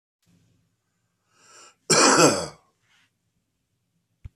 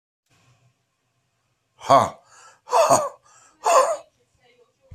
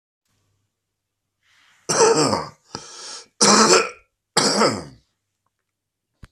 cough_length: 4.4 s
cough_amplitude: 23590
cough_signal_mean_std_ratio: 0.28
exhalation_length: 4.9 s
exhalation_amplitude: 25373
exhalation_signal_mean_std_ratio: 0.34
three_cough_length: 6.3 s
three_cough_amplitude: 30330
three_cough_signal_mean_std_ratio: 0.39
survey_phase: beta (2021-08-13 to 2022-03-07)
age: 45-64
gender: Male
wearing_mask: 'No'
symptom_cough_any: true
symptom_runny_or_blocked_nose: true
symptom_sore_throat: true
symptom_change_to_sense_of_smell_or_taste: true
symptom_loss_of_taste: true
symptom_onset: 4 days
smoker_status: Ex-smoker
respiratory_condition_asthma: false
respiratory_condition_other: false
recruitment_source: Test and Trace
submission_delay: 2 days
covid_test_result: Positive
covid_test_method: RT-qPCR
covid_ct_value: 19.4
covid_ct_gene: ORF1ab gene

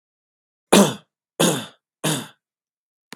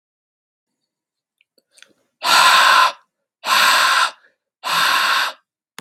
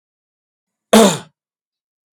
three_cough_length: 3.2 s
three_cough_amplitude: 32768
three_cough_signal_mean_std_ratio: 0.31
exhalation_length: 5.8 s
exhalation_amplitude: 32768
exhalation_signal_mean_std_ratio: 0.5
cough_length: 2.1 s
cough_amplitude: 32768
cough_signal_mean_std_ratio: 0.27
survey_phase: beta (2021-08-13 to 2022-03-07)
age: 18-44
gender: Male
wearing_mask: 'No'
symptom_none: true
smoker_status: Ex-smoker
respiratory_condition_asthma: false
respiratory_condition_other: false
recruitment_source: REACT
submission_delay: 1 day
covid_test_result: Negative
covid_test_method: RT-qPCR
influenza_a_test_result: Unknown/Void
influenza_b_test_result: Unknown/Void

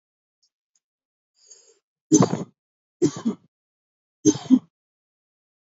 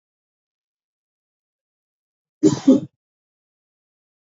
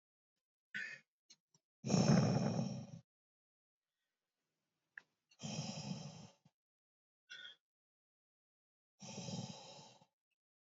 three_cough_length: 5.7 s
three_cough_amplitude: 24764
three_cough_signal_mean_std_ratio: 0.24
cough_length: 4.3 s
cough_amplitude: 25473
cough_signal_mean_std_ratio: 0.19
exhalation_length: 10.7 s
exhalation_amplitude: 3570
exhalation_signal_mean_std_ratio: 0.32
survey_phase: beta (2021-08-13 to 2022-03-07)
age: 18-44
gender: Male
wearing_mask: 'No'
symptom_cough_any: true
symptom_runny_or_blocked_nose: true
smoker_status: Never smoked
respiratory_condition_asthma: false
respiratory_condition_other: false
recruitment_source: REACT
submission_delay: 2 days
covid_test_result: Negative
covid_test_method: RT-qPCR
influenza_a_test_result: Negative
influenza_b_test_result: Negative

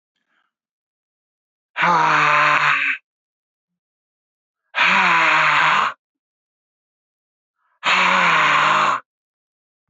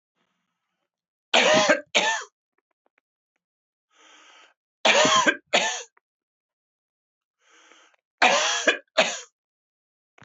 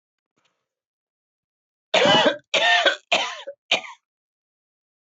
exhalation_length: 9.9 s
exhalation_amplitude: 25946
exhalation_signal_mean_std_ratio: 0.53
three_cough_length: 10.2 s
three_cough_amplitude: 23878
three_cough_signal_mean_std_ratio: 0.36
cough_length: 5.1 s
cough_amplitude: 21097
cough_signal_mean_std_ratio: 0.38
survey_phase: alpha (2021-03-01 to 2021-08-12)
age: 45-64
gender: Male
wearing_mask: 'No'
symptom_cough_any: true
symptom_fatigue: true
symptom_change_to_sense_of_smell_or_taste: true
symptom_loss_of_taste: true
symptom_onset: 4 days
smoker_status: Ex-smoker
respiratory_condition_asthma: false
respiratory_condition_other: false
recruitment_source: Test and Trace
submission_delay: 2 days
covid_test_result: Positive
covid_test_method: RT-qPCR
covid_ct_value: 23.3
covid_ct_gene: ORF1ab gene
covid_ct_mean: 23.8
covid_viral_load: 16000 copies/ml
covid_viral_load_category: Low viral load (10K-1M copies/ml)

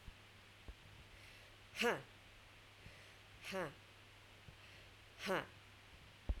exhalation_length: 6.4 s
exhalation_amplitude: 2041
exhalation_signal_mean_std_ratio: 0.44
survey_phase: beta (2021-08-13 to 2022-03-07)
age: 45-64
gender: Female
wearing_mask: 'No'
symptom_none: true
smoker_status: Ex-smoker
respiratory_condition_asthma: false
respiratory_condition_other: false
recruitment_source: REACT
submission_delay: 1 day
covid_test_result: Negative
covid_test_method: RT-qPCR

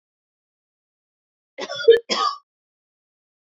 cough_length: 3.4 s
cough_amplitude: 25547
cough_signal_mean_std_ratio: 0.25
survey_phase: beta (2021-08-13 to 2022-03-07)
age: 45-64
gender: Female
wearing_mask: 'No'
symptom_none: true
smoker_status: Never smoked
respiratory_condition_asthma: false
respiratory_condition_other: false
recruitment_source: REACT
submission_delay: 0 days
covid_test_result: Negative
covid_test_method: RT-qPCR
influenza_a_test_result: Negative
influenza_b_test_result: Negative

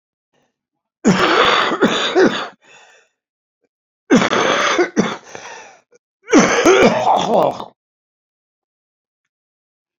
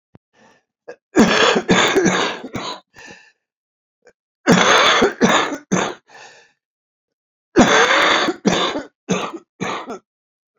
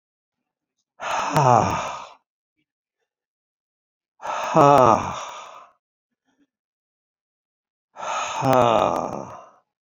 three_cough_length: 10.0 s
three_cough_amplitude: 32764
three_cough_signal_mean_std_ratio: 0.49
cough_length: 10.6 s
cough_amplitude: 29739
cough_signal_mean_std_ratio: 0.51
exhalation_length: 9.8 s
exhalation_amplitude: 27819
exhalation_signal_mean_std_ratio: 0.36
survey_phase: beta (2021-08-13 to 2022-03-07)
age: 65+
gender: Male
wearing_mask: 'Yes'
symptom_cough_any: true
symptom_runny_or_blocked_nose: true
symptom_shortness_of_breath: true
symptom_onset: 4 days
smoker_status: Ex-smoker
respiratory_condition_asthma: false
respiratory_condition_other: true
recruitment_source: Test and Trace
submission_delay: 1 day
covid_test_result: Positive
covid_test_method: RT-qPCR
covid_ct_value: 13.3
covid_ct_gene: N gene
covid_ct_mean: 14.0
covid_viral_load: 26000000 copies/ml
covid_viral_load_category: High viral load (>1M copies/ml)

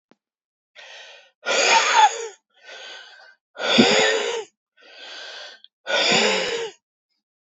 exhalation_length: 7.6 s
exhalation_amplitude: 29485
exhalation_signal_mean_std_ratio: 0.48
survey_phase: beta (2021-08-13 to 2022-03-07)
age: 45-64
gender: Male
wearing_mask: 'No'
symptom_cough_any: true
symptom_runny_or_blocked_nose: true
symptom_sore_throat: true
symptom_fatigue: true
symptom_fever_high_temperature: true
symptom_headache: true
symptom_onset: 3 days
smoker_status: Ex-smoker
respiratory_condition_asthma: false
respiratory_condition_other: false
recruitment_source: Test and Trace
submission_delay: 2 days
covid_test_result: Positive
covid_test_method: RT-qPCR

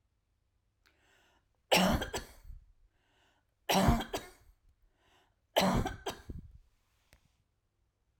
three_cough_length: 8.2 s
three_cough_amplitude: 7742
three_cough_signal_mean_std_ratio: 0.33
survey_phase: alpha (2021-03-01 to 2021-08-12)
age: 45-64
gender: Female
wearing_mask: 'No'
symptom_none: true
smoker_status: Never smoked
respiratory_condition_asthma: false
respiratory_condition_other: false
recruitment_source: REACT
submission_delay: 1 day
covid_test_result: Negative
covid_test_method: RT-qPCR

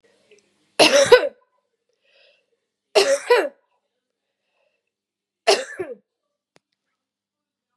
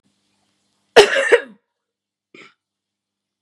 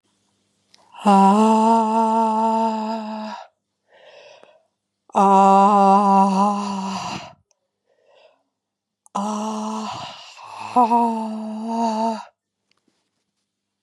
three_cough_length: 7.8 s
three_cough_amplitude: 32767
three_cough_signal_mean_std_ratio: 0.28
cough_length: 3.4 s
cough_amplitude: 32768
cough_signal_mean_std_ratio: 0.24
exhalation_length: 13.8 s
exhalation_amplitude: 21428
exhalation_signal_mean_std_ratio: 0.56
survey_phase: beta (2021-08-13 to 2022-03-07)
age: 18-44
gender: Female
wearing_mask: 'No'
symptom_runny_or_blocked_nose: true
symptom_fatigue: true
symptom_onset: 6 days
smoker_status: Ex-smoker
respiratory_condition_asthma: false
respiratory_condition_other: false
recruitment_source: Test and Trace
submission_delay: 2 days
covid_test_result: Positive
covid_test_method: RT-qPCR
covid_ct_value: 17.4
covid_ct_gene: ORF1ab gene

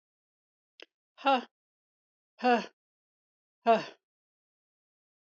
exhalation_length: 5.3 s
exhalation_amplitude: 7115
exhalation_signal_mean_std_ratio: 0.24
survey_phase: beta (2021-08-13 to 2022-03-07)
age: 45-64
gender: Female
wearing_mask: 'No'
symptom_none: true
smoker_status: Never smoked
respiratory_condition_asthma: false
respiratory_condition_other: false
recruitment_source: REACT
submission_delay: 2 days
covid_test_result: Negative
covid_test_method: RT-qPCR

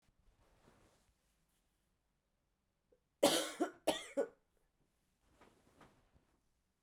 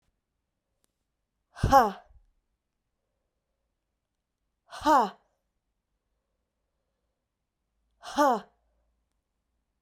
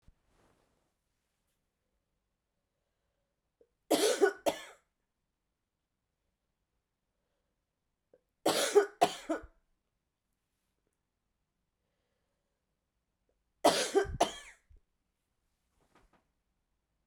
cough_length: 6.8 s
cough_amplitude: 5271
cough_signal_mean_std_ratio: 0.23
exhalation_length: 9.8 s
exhalation_amplitude: 17227
exhalation_signal_mean_std_ratio: 0.21
three_cough_length: 17.1 s
three_cough_amplitude: 9010
three_cough_signal_mean_std_ratio: 0.23
survey_phase: beta (2021-08-13 to 2022-03-07)
age: 18-44
gender: Female
wearing_mask: 'No'
symptom_cough_any: true
symptom_runny_or_blocked_nose: true
symptom_shortness_of_breath: true
symptom_sore_throat: true
symptom_abdominal_pain: true
symptom_diarrhoea: true
symptom_fatigue: true
symptom_fever_high_temperature: true
symptom_headache: true
symptom_change_to_sense_of_smell_or_taste: true
symptom_onset: 5 days
smoker_status: Never smoked
respiratory_condition_asthma: false
respiratory_condition_other: false
recruitment_source: Test and Trace
submission_delay: 2 days
covid_test_result: Positive
covid_test_method: RT-qPCR
covid_ct_value: 17.5
covid_ct_gene: ORF1ab gene
covid_ct_mean: 18.2
covid_viral_load: 1100000 copies/ml
covid_viral_load_category: High viral load (>1M copies/ml)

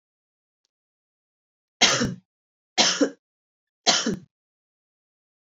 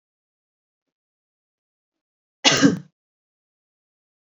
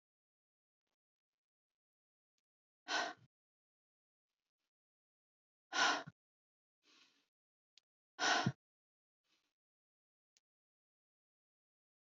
three_cough_length: 5.5 s
three_cough_amplitude: 27308
three_cough_signal_mean_std_ratio: 0.3
cough_length: 4.3 s
cough_amplitude: 28143
cough_signal_mean_std_ratio: 0.2
exhalation_length: 12.0 s
exhalation_amplitude: 3033
exhalation_signal_mean_std_ratio: 0.2
survey_phase: beta (2021-08-13 to 2022-03-07)
age: 18-44
gender: Female
wearing_mask: 'No'
symptom_none: true
smoker_status: Never smoked
respiratory_condition_asthma: false
respiratory_condition_other: false
recruitment_source: Test and Trace
submission_delay: 1 day
covid_test_result: Negative
covid_test_method: RT-qPCR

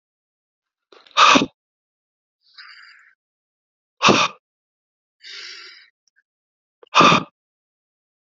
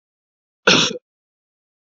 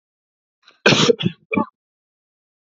exhalation_length: 8.4 s
exhalation_amplitude: 28875
exhalation_signal_mean_std_ratio: 0.25
cough_length: 2.0 s
cough_amplitude: 29978
cough_signal_mean_std_ratio: 0.28
three_cough_length: 2.7 s
three_cough_amplitude: 29200
three_cough_signal_mean_std_ratio: 0.31
survey_phase: beta (2021-08-13 to 2022-03-07)
age: 18-44
gender: Male
wearing_mask: 'No'
symptom_cough_any: true
symptom_runny_or_blocked_nose: true
smoker_status: Never smoked
respiratory_condition_asthma: false
respiratory_condition_other: false
recruitment_source: Test and Trace
submission_delay: 2 days
covid_test_result: Positive
covid_test_method: RT-qPCR
covid_ct_value: 20.5
covid_ct_gene: N gene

